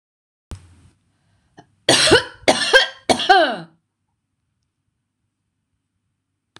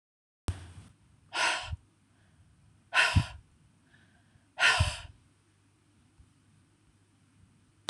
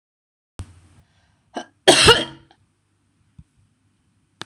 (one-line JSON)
{"three_cough_length": "6.6 s", "three_cough_amplitude": 26028, "three_cough_signal_mean_std_ratio": 0.32, "exhalation_length": "7.9 s", "exhalation_amplitude": 10994, "exhalation_signal_mean_std_ratio": 0.31, "cough_length": "4.5 s", "cough_amplitude": 26028, "cough_signal_mean_std_ratio": 0.23, "survey_phase": "beta (2021-08-13 to 2022-03-07)", "age": "45-64", "gender": "Female", "wearing_mask": "No", "symptom_none": true, "smoker_status": "Ex-smoker", "respiratory_condition_asthma": false, "respiratory_condition_other": false, "recruitment_source": "REACT", "submission_delay": "2 days", "covid_test_result": "Negative", "covid_test_method": "RT-qPCR"}